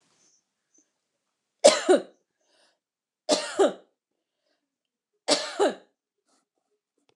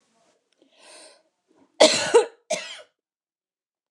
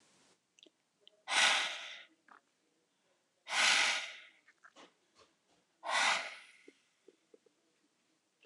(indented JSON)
{
  "three_cough_length": "7.2 s",
  "three_cough_amplitude": 28316,
  "three_cough_signal_mean_std_ratio": 0.26,
  "cough_length": "3.9 s",
  "cough_amplitude": 27995,
  "cough_signal_mean_std_ratio": 0.26,
  "exhalation_length": "8.5 s",
  "exhalation_amplitude": 6359,
  "exhalation_signal_mean_std_ratio": 0.35,
  "survey_phase": "beta (2021-08-13 to 2022-03-07)",
  "age": "45-64",
  "gender": "Female",
  "wearing_mask": "No",
  "symptom_none": true,
  "smoker_status": "Ex-smoker",
  "respiratory_condition_asthma": false,
  "respiratory_condition_other": false,
  "recruitment_source": "REACT",
  "submission_delay": "4 days",
  "covid_test_result": "Negative",
  "covid_test_method": "RT-qPCR",
  "influenza_a_test_result": "Unknown/Void",
  "influenza_b_test_result": "Unknown/Void"
}